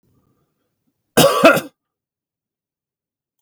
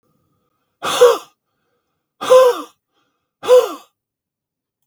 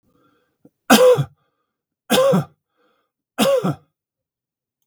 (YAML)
cough_length: 3.4 s
cough_amplitude: 32768
cough_signal_mean_std_ratio: 0.27
exhalation_length: 4.9 s
exhalation_amplitude: 32768
exhalation_signal_mean_std_ratio: 0.33
three_cough_length: 4.9 s
three_cough_amplitude: 32768
three_cough_signal_mean_std_ratio: 0.38
survey_phase: beta (2021-08-13 to 2022-03-07)
age: 65+
gender: Male
wearing_mask: 'No'
symptom_none: true
smoker_status: Never smoked
respiratory_condition_asthma: false
respiratory_condition_other: false
recruitment_source: REACT
submission_delay: 3 days
covid_test_result: Negative
covid_test_method: RT-qPCR
influenza_a_test_result: Negative
influenza_b_test_result: Negative